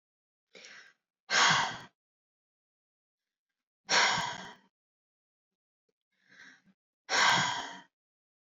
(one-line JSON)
{"exhalation_length": "8.5 s", "exhalation_amplitude": 7458, "exhalation_signal_mean_std_ratio": 0.33, "survey_phase": "alpha (2021-03-01 to 2021-08-12)", "age": "45-64", "gender": "Female", "wearing_mask": "No", "symptom_none": true, "smoker_status": "Never smoked", "respiratory_condition_asthma": false, "respiratory_condition_other": false, "recruitment_source": "REACT", "submission_delay": "1 day", "covid_test_result": "Negative", "covid_test_method": "RT-qPCR"}